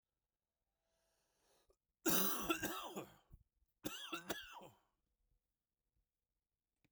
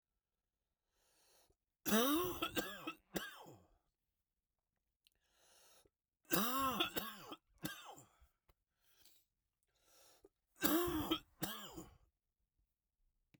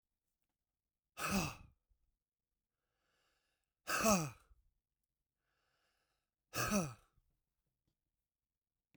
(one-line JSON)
{"cough_length": "6.9 s", "cough_amplitude": 2771, "cough_signal_mean_std_ratio": 0.32, "three_cough_length": "13.4 s", "three_cough_amplitude": 4701, "three_cough_signal_mean_std_ratio": 0.36, "exhalation_length": "9.0 s", "exhalation_amplitude": 3788, "exhalation_signal_mean_std_ratio": 0.27, "survey_phase": "beta (2021-08-13 to 2022-03-07)", "age": "45-64", "gender": "Male", "wearing_mask": "No", "symptom_cough_any": true, "symptom_runny_or_blocked_nose": true, "symptom_sore_throat": true, "symptom_fatigue": true, "symptom_headache": true, "symptom_onset": "3 days", "smoker_status": "Never smoked", "respiratory_condition_asthma": false, "respiratory_condition_other": false, "recruitment_source": "Test and Trace", "submission_delay": "2 days", "covid_test_result": "Positive", "covid_test_method": "RT-qPCR", "covid_ct_value": 18.5, "covid_ct_gene": "N gene", "covid_ct_mean": 18.6, "covid_viral_load": "760000 copies/ml", "covid_viral_load_category": "Low viral load (10K-1M copies/ml)"}